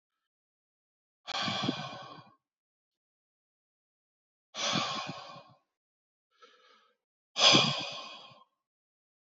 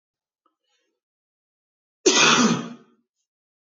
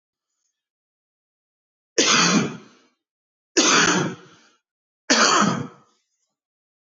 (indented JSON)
{
  "exhalation_length": "9.3 s",
  "exhalation_amplitude": 12680,
  "exhalation_signal_mean_std_ratio": 0.3,
  "cough_length": "3.8 s",
  "cough_amplitude": 20595,
  "cough_signal_mean_std_ratio": 0.32,
  "three_cough_length": "6.8 s",
  "three_cough_amplitude": 19840,
  "three_cough_signal_mean_std_ratio": 0.41,
  "survey_phase": "beta (2021-08-13 to 2022-03-07)",
  "age": "18-44",
  "gender": "Male",
  "wearing_mask": "No",
  "symptom_none": true,
  "smoker_status": "Never smoked",
  "respiratory_condition_asthma": true,
  "respiratory_condition_other": false,
  "recruitment_source": "REACT",
  "submission_delay": "1 day",
  "covid_test_result": "Negative",
  "covid_test_method": "RT-qPCR"
}